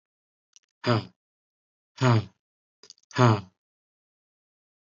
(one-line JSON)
{"exhalation_length": "4.9 s", "exhalation_amplitude": 17392, "exhalation_signal_mean_std_ratio": 0.28, "survey_phase": "beta (2021-08-13 to 2022-03-07)", "age": "18-44", "gender": "Male", "wearing_mask": "No", "symptom_none": true, "smoker_status": "Never smoked", "respiratory_condition_asthma": false, "respiratory_condition_other": false, "recruitment_source": "REACT", "submission_delay": "1 day", "covid_test_result": "Negative", "covid_test_method": "RT-qPCR", "influenza_a_test_result": "Negative", "influenza_b_test_result": "Negative"}